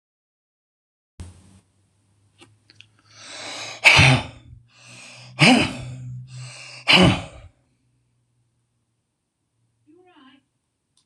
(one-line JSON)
{"exhalation_length": "11.1 s", "exhalation_amplitude": 26028, "exhalation_signal_mean_std_ratio": 0.28, "survey_phase": "beta (2021-08-13 to 2022-03-07)", "age": "65+", "gender": "Male", "wearing_mask": "No", "symptom_none": true, "smoker_status": "Ex-smoker", "respiratory_condition_asthma": false, "respiratory_condition_other": false, "recruitment_source": "REACT", "submission_delay": "9 days", "covid_test_result": "Negative", "covid_test_method": "RT-qPCR"}